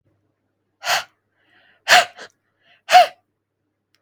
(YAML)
exhalation_length: 4.0 s
exhalation_amplitude: 32768
exhalation_signal_mean_std_ratio: 0.26
survey_phase: beta (2021-08-13 to 2022-03-07)
age: 18-44
gender: Female
wearing_mask: 'No'
symptom_none: true
smoker_status: Never smoked
respiratory_condition_asthma: false
respiratory_condition_other: false
recruitment_source: REACT
submission_delay: 2 days
covid_test_result: Negative
covid_test_method: RT-qPCR
influenza_a_test_result: Negative
influenza_b_test_result: Negative